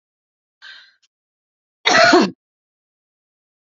{"cough_length": "3.8 s", "cough_amplitude": 32767, "cough_signal_mean_std_ratio": 0.28, "survey_phase": "beta (2021-08-13 to 2022-03-07)", "age": "45-64", "gender": "Female", "wearing_mask": "No", "symptom_none": true, "symptom_onset": "6 days", "smoker_status": "Never smoked", "respiratory_condition_asthma": false, "respiratory_condition_other": false, "recruitment_source": "REACT", "submission_delay": "1 day", "covid_test_result": "Negative", "covid_test_method": "RT-qPCR", "influenza_a_test_result": "Unknown/Void", "influenza_b_test_result": "Unknown/Void"}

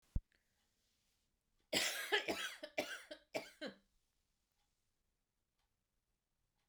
{"three_cough_length": "6.7 s", "three_cough_amplitude": 3137, "three_cough_signal_mean_std_ratio": 0.32, "survey_phase": "beta (2021-08-13 to 2022-03-07)", "age": "45-64", "gender": "Female", "wearing_mask": "No", "symptom_cough_any": true, "symptom_runny_or_blocked_nose": true, "symptom_fatigue": true, "symptom_headache": true, "symptom_onset": "3 days", "smoker_status": "Never smoked", "respiratory_condition_asthma": false, "respiratory_condition_other": false, "recruitment_source": "Test and Trace", "submission_delay": "1 day", "covid_test_result": "Positive", "covid_test_method": "ePCR"}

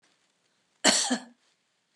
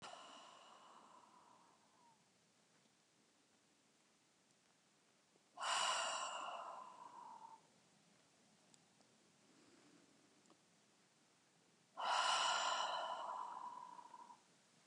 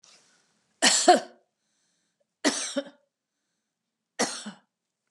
{"cough_length": "2.0 s", "cough_amplitude": 17178, "cough_signal_mean_std_ratio": 0.32, "exhalation_length": "14.9 s", "exhalation_amplitude": 1652, "exhalation_signal_mean_std_ratio": 0.42, "three_cough_length": "5.1 s", "three_cough_amplitude": 20066, "three_cough_signal_mean_std_ratio": 0.28, "survey_phase": "beta (2021-08-13 to 2022-03-07)", "age": "65+", "gender": "Female", "wearing_mask": "No", "symptom_none": true, "smoker_status": "Never smoked", "respiratory_condition_asthma": false, "respiratory_condition_other": false, "recruitment_source": "REACT", "submission_delay": "2 days", "covid_test_result": "Negative", "covid_test_method": "RT-qPCR", "influenza_a_test_result": "Negative", "influenza_b_test_result": "Negative"}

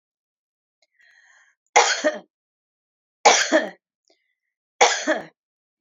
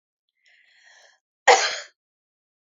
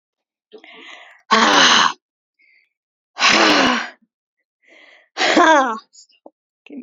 {"three_cough_length": "5.8 s", "three_cough_amplitude": 29938, "three_cough_signal_mean_std_ratio": 0.31, "cough_length": "2.6 s", "cough_amplitude": 27726, "cough_signal_mean_std_ratio": 0.22, "exhalation_length": "6.8 s", "exhalation_amplitude": 31236, "exhalation_signal_mean_std_ratio": 0.44, "survey_phase": "beta (2021-08-13 to 2022-03-07)", "age": "45-64", "gender": "Female", "wearing_mask": "No", "symptom_none": true, "smoker_status": "Never smoked", "respiratory_condition_asthma": false, "respiratory_condition_other": false, "recruitment_source": "REACT", "submission_delay": "1 day", "covid_test_result": "Negative", "covid_test_method": "RT-qPCR", "influenza_a_test_result": "Negative", "influenza_b_test_result": "Negative"}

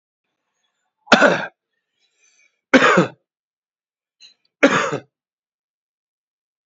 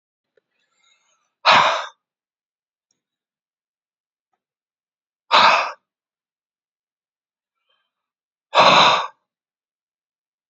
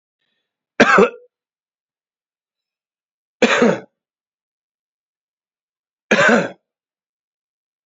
{"three_cough_length": "6.7 s", "three_cough_amplitude": 29122, "three_cough_signal_mean_std_ratio": 0.28, "exhalation_length": "10.5 s", "exhalation_amplitude": 32768, "exhalation_signal_mean_std_ratio": 0.27, "cough_length": "7.9 s", "cough_amplitude": 28742, "cough_signal_mean_std_ratio": 0.28, "survey_phase": "alpha (2021-03-01 to 2021-08-12)", "age": "18-44", "gender": "Male", "wearing_mask": "No", "symptom_cough_any": true, "symptom_fatigue": true, "smoker_status": "Ex-smoker", "respiratory_condition_asthma": false, "respiratory_condition_other": false, "recruitment_source": "Test and Trace", "submission_delay": "1 day", "covid_test_result": "Positive", "covid_test_method": "RT-qPCR", "covid_ct_value": 14.5, "covid_ct_gene": "ORF1ab gene", "covid_ct_mean": 15.3, "covid_viral_load": "9900000 copies/ml", "covid_viral_load_category": "High viral load (>1M copies/ml)"}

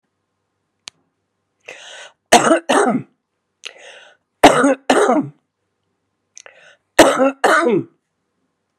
{"three_cough_length": "8.8 s", "three_cough_amplitude": 32768, "three_cough_signal_mean_std_ratio": 0.37, "survey_phase": "beta (2021-08-13 to 2022-03-07)", "age": "65+", "gender": "Female", "wearing_mask": "No", "symptom_none": true, "smoker_status": "Ex-smoker", "respiratory_condition_asthma": false, "respiratory_condition_other": false, "recruitment_source": "REACT", "submission_delay": "3 days", "covid_test_result": "Negative", "covid_test_method": "RT-qPCR", "influenza_a_test_result": "Negative", "influenza_b_test_result": "Negative"}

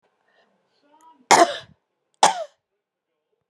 {"cough_length": "3.5 s", "cough_amplitude": 32761, "cough_signal_mean_std_ratio": 0.23, "survey_phase": "beta (2021-08-13 to 2022-03-07)", "age": "45-64", "gender": "Female", "wearing_mask": "Yes", "symptom_none": true, "smoker_status": "Never smoked", "respiratory_condition_asthma": false, "respiratory_condition_other": false, "recruitment_source": "REACT", "submission_delay": "3 days", "covid_test_result": "Negative", "covid_test_method": "RT-qPCR", "influenza_a_test_result": "Negative", "influenza_b_test_result": "Negative"}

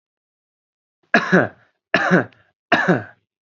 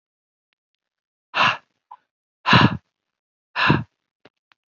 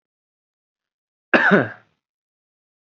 {"three_cough_length": "3.6 s", "three_cough_amplitude": 28699, "three_cough_signal_mean_std_ratio": 0.37, "exhalation_length": "4.8 s", "exhalation_amplitude": 27412, "exhalation_signal_mean_std_ratio": 0.29, "cough_length": "2.8 s", "cough_amplitude": 28269, "cough_signal_mean_std_ratio": 0.25, "survey_phase": "beta (2021-08-13 to 2022-03-07)", "age": "18-44", "gender": "Male", "wearing_mask": "No", "symptom_none": true, "smoker_status": "Never smoked", "respiratory_condition_asthma": false, "respiratory_condition_other": false, "recruitment_source": "REACT", "submission_delay": "1 day", "covid_test_result": "Negative", "covid_test_method": "RT-qPCR", "influenza_a_test_result": "Negative", "influenza_b_test_result": "Negative"}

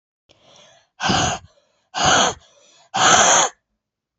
{"exhalation_length": "4.2 s", "exhalation_amplitude": 31643, "exhalation_signal_mean_std_ratio": 0.46, "survey_phase": "beta (2021-08-13 to 2022-03-07)", "age": "18-44", "gender": "Female", "wearing_mask": "No", "symptom_cough_any": true, "symptom_sore_throat": true, "symptom_fatigue": true, "symptom_fever_high_temperature": true, "symptom_headache": true, "symptom_other": true, "symptom_onset": "3 days", "smoker_status": "Current smoker (e-cigarettes or vapes only)", "respiratory_condition_asthma": true, "respiratory_condition_other": false, "recruitment_source": "Test and Trace", "submission_delay": "2 days", "covid_test_result": "Positive", "covid_test_method": "RT-qPCR", "covid_ct_value": 17.7, "covid_ct_gene": "ORF1ab gene", "covid_ct_mean": 17.9, "covid_viral_load": "1300000 copies/ml", "covid_viral_load_category": "High viral load (>1M copies/ml)"}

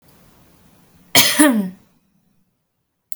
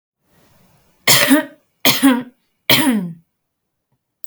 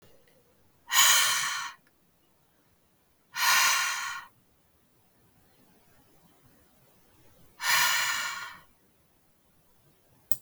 {"cough_length": "3.2 s", "cough_amplitude": 32768, "cough_signal_mean_std_ratio": 0.33, "three_cough_length": "4.3 s", "three_cough_amplitude": 32768, "three_cough_signal_mean_std_ratio": 0.41, "exhalation_length": "10.4 s", "exhalation_amplitude": 26291, "exhalation_signal_mean_std_ratio": 0.38, "survey_phase": "beta (2021-08-13 to 2022-03-07)", "age": "18-44", "gender": "Female", "wearing_mask": "No", "symptom_none": true, "smoker_status": "Never smoked", "respiratory_condition_asthma": false, "respiratory_condition_other": false, "recruitment_source": "REACT", "submission_delay": "3 days", "covid_test_result": "Negative", "covid_test_method": "RT-qPCR", "influenza_a_test_result": "Negative", "influenza_b_test_result": "Negative"}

